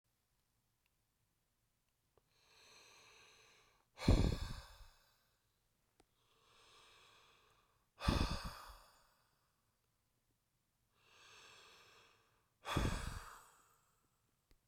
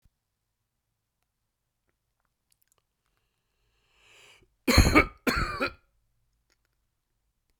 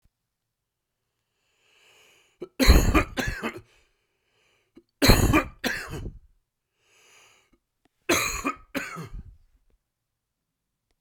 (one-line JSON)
{"exhalation_length": "14.7 s", "exhalation_amplitude": 3546, "exhalation_signal_mean_std_ratio": 0.25, "cough_length": "7.6 s", "cough_amplitude": 19688, "cough_signal_mean_std_ratio": 0.22, "three_cough_length": "11.0 s", "three_cough_amplitude": 26884, "three_cough_signal_mean_std_ratio": 0.31, "survey_phase": "beta (2021-08-13 to 2022-03-07)", "age": "45-64", "gender": "Male", "wearing_mask": "No", "symptom_cough_any": true, "symptom_runny_or_blocked_nose": true, "symptom_shortness_of_breath": true, "symptom_abdominal_pain": true, "symptom_headache": true, "symptom_onset": "2 days", "smoker_status": "Ex-smoker", "respiratory_condition_asthma": true, "respiratory_condition_other": false, "recruitment_source": "Test and Trace", "submission_delay": "1 day", "covid_test_result": "Positive", "covid_test_method": "ePCR"}